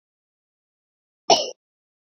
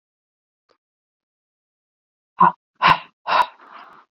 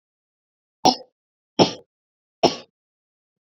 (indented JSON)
{
  "cough_length": "2.1 s",
  "cough_amplitude": 27360,
  "cough_signal_mean_std_ratio": 0.19,
  "exhalation_length": "4.2 s",
  "exhalation_amplitude": 29507,
  "exhalation_signal_mean_std_ratio": 0.25,
  "three_cough_length": "3.4 s",
  "three_cough_amplitude": 27674,
  "three_cough_signal_mean_std_ratio": 0.21,
  "survey_phase": "beta (2021-08-13 to 2022-03-07)",
  "age": "18-44",
  "gender": "Female",
  "wearing_mask": "No",
  "symptom_cough_any": true,
  "symptom_runny_or_blocked_nose": true,
  "symptom_shortness_of_breath": true,
  "symptom_sore_throat": true,
  "symptom_fatigue": true,
  "symptom_headache": true,
  "symptom_change_to_sense_of_smell_or_taste": true,
  "symptom_onset": "3 days",
  "smoker_status": "Never smoked",
  "respiratory_condition_asthma": true,
  "respiratory_condition_other": false,
  "recruitment_source": "Test and Trace",
  "submission_delay": "2 days",
  "covid_test_result": "Positive",
  "covid_test_method": "RT-qPCR",
  "covid_ct_value": 20.4,
  "covid_ct_gene": "ORF1ab gene",
  "covid_ct_mean": 21.0,
  "covid_viral_load": "130000 copies/ml",
  "covid_viral_load_category": "Low viral load (10K-1M copies/ml)"
}